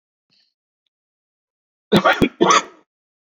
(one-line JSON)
{"cough_length": "3.3 s", "cough_amplitude": 31648, "cough_signal_mean_std_ratio": 0.31, "survey_phase": "beta (2021-08-13 to 2022-03-07)", "age": "45-64", "gender": "Male", "wearing_mask": "No", "symptom_none": true, "smoker_status": "Current smoker (1 to 10 cigarettes per day)", "respiratory_condition_asthma": false, "respiratory_condition_other": false, "recruitment_source": "REACT", "submission_delay": "2 days", "covid_test_result": "Negative", "covid_test_method": "RT-qPCR", "influenza_a_test_result": "Negative", "influenza_b_test_result": "Negative"}